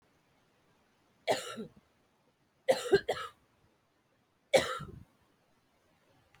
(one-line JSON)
{"three_cough_length": "6.4 s", "three_cough_amplitude": 8216, "three_cough_signal_mean_std_ratio": 0.26, "survey_phase": "beta (2021-08-13 to 2022-03-07)", "age": "45-64", "gender": "Female", "wearing_mask": "No", "symptom_cough_any": true, "symptom_runny_or_blocked_nose": true, "symptom_shortness_of_breath": true, "symptom_sore_throat": true, "symptom_abdominal_pain": true, "symptom_fatigue": true, "symptom_fever_high_temperature": true, "symptom_headache": true, "symptom_other": true, "symptom_onset": "4 days", "smoker_status": "Never smoked", "respiratory_condition_asthma": false, "respiratory_condition_other": false, "recruitment_source": "Test and Trace", "submission_delay": "2 days", "covid_test_result": "Positive", "covid_test_method": "RT-qPCR", "covid_ct_value": 17.0, "covid_ct_gene": "ORF1ab gene"}